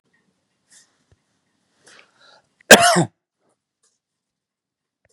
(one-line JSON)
{"cough_length": "5.1 s", "cough_amplitude": 32768, "cough_signal_mean_std_ratio": 0.18, "survey_phase": "beta (2021-08-13 to 2022-03-07)", "age": "65+", "gender": "Male", "wearing_mask": "No", "symptom_none": true, "smoker_status": "Ex-smoker", "respiratory_condition_asthma": false, "respiratory_condition_other": false, "recruitment_source": "REACT", "submission_delay": "5 days", "covid_test_result": "Negative", "covid_test_method": "RT-qPCR", "influenza_a_test_result": "Negative", "influenza_b_test_result": "Negative"}